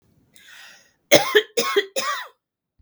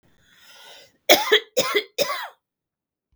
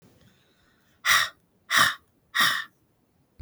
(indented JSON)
{
  "cough_length": "2.8 s",
  "cough_amplitude": 32768,
  "cough_signal_mean_std_ratio": 0.37,
  "three_cough_length": "3.2 s",
  "three_cough_amplitude": 32768,
  "three_cough_signal_mean_std_ratio": 0.34,
  "exhalation_length": "3.4 s",
  "exhalation_amplitude": 15635,
  "exhalation_signal_mean_std_ratio": 0.37,
  "survey_phase": "beta (2021-08-13 to 2022-03-07)",
  "age": "65+",
  "gender": "Female",
  "wearing_mask": "No",
  "symptom_none": true,
  "symptom_onset": "12 days",
  "smoker_status": "Ex-smoker",
  "respiratory_condition_asthma": true,
  "respiratory_condition_other": false,
  "recruitment_source": "REACT",
  "submission_delay": "3 days",
  "covid_test_result": "Negative",
  "covid_test_method": "RT-qPCR",
  "influenza_a_test_result": "Negative",
  "influenza_b_test_result": "Negative"
}